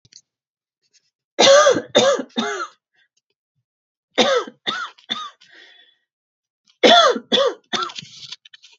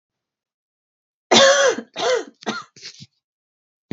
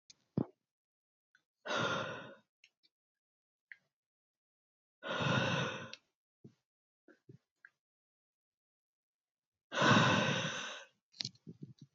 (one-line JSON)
{"three_cough_length": "8.8 s", "three_cough_amplitude": 32767, "three_cough_signal_mean_std_ratio": 0.38, "cough_length": "3.9 s", "cough_amplitude": 32768, "cough_signal_mean_std_ratio": 0.36, "exhalation_length": "11.9 s", "exhalation_amplitude": 6121, "exhalation_signal_mean_std_ratio": 0.34, "survey_phase": "beta (2021-08-13 to 2022-03-07)", "age": "18-44", "gender": "Female", "wearing_mask": "No", "symptom_none": true, "smoker_status": "Never smoked", "respiratory_condition_asthma": false, "respiratory_condition_other": false, "recruitment_source": "REACT", "submission_delay": "1 day", "covid_test_result": "Negative", "covid_test_method": "RT-qPCR", "influenza_a_test_result": "Negative", "influenza_b_test_result": "Negative"}